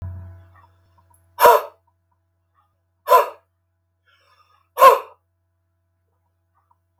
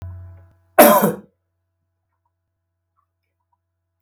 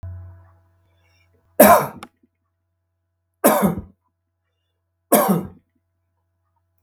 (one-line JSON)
{"exhalation_length": "7.0 s", "exhalation_amplitude": 32768, "exhalation_signal_mean_std_ratio": 0.23, "cough_length": "4.0 s", "cough_amplitude": 32768, "cough_signal_mean_std_ratio": 0.24, "three_cough_length": "6.8 s", "three_cough_amplitude": 32768, "three_cough_signal_mean_std_ratio": 0.28, "survey_phase": "beta (2021-08-13 to 2022-03-07)", "age": "45-64", "gender": "Male", "wearing_mask": "No", "symptom_none": true, "smoker_status": "Never smoked", "respiratory_condition_asthma": false, "respiratory_condition_other": false, "recruitment_source": "REACT", "submission_delay": "1 day", "covid_test_result": "Negative", "covid_test_method": "RT-qPCR", "influenza_a_test_result": "Negative", "influenza_b_test_result": "Negative"}